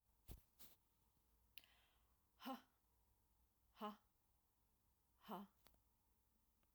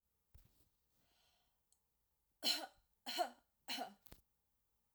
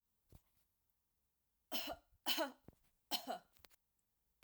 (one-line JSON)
{"exhalation_length": "6.7 s", "exhalation_amplitude": 449, "exhalation_signal_mean_std_ratio": 0.34, "three_cough_length": "4.9 s", "three_cough_amplitude": 2096, "three_cough_signal_mean_std_ratio": 0.29, "cough_length": "4.4 s", "cough_amplitude": 2450, "cough_signal_mean_std_ratio": 0.32, "survey_phase": "alpha (2021-03-01 to 2021-08-12)", "age": "45-64", "gender": "Female", "wearing_mask": "No", "symptom_none": true, "smoker_status": "Ex-smoker", "respiratory_condition_asthma": false, "respiratory_condition_other": false, "recruitment_source": "REACT", "submission_delay": "3 days", "covid_test_result": "Negative", "covid_test_method": "RT-qPCR"}